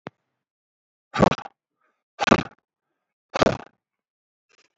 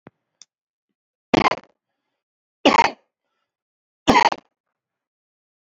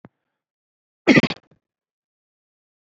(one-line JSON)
{"exhalation_length": "4.8 s", "exhalation_amplitude": 28266, "exhalation_signal_mean_std_ratio": 0.2, "three_cough_length": "5.7 s", "three_cough_amplitude": 28263, "three_cough_signal_mean_std_ratio": 0.23, "cough_length": "2.9 s", "cough_amplitude": 27763, "cough_signal_mean_std_ratio": 0.19, "survey_phase": "beta (2021-08-13 to 2022-03-07)", "age": "45-64", "gender": "Male", "wearing_mask": "No", "symptom_other": true, "smoker_status": "Never smoked", "respiratory_condition_asthma": false, "respiratory_condition_other": false, "recruitment_source": "REACT", "submission_delay": "2 days", "covid_test_result": "Negative", "covid_test_method": "RT-qPCR", "influenza_a_test_result": "Negative", "influenza_b_test_result": "Negative"}